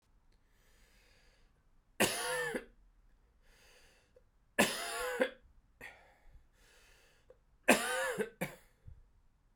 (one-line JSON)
{"three_cough_length": "9.6 s", "three_cough_amplitude": 9967, "three_cough_signal_mean_std_ratio": 0.34, "survey_phase": "beta (2021-08-13 to 2022-03-07)", "age": "45-64", "gender": "Male", "wearing_mask": "No", "symptom_cough_any": true, "symptom_runny_or_blocked_nose": true, "symptom_abdominal_pain": true, "symptom_fatigue": true, "symptom_headache": true, "smoker_status": "Never smoked", "respiratory_condition_asthma": false, "respiratory_condition_other": false, "recruitment_source": "Test and Trace", "submission_delay": "1 day", "covid_test_result": "Positive", "covid_test_method": "LFT"}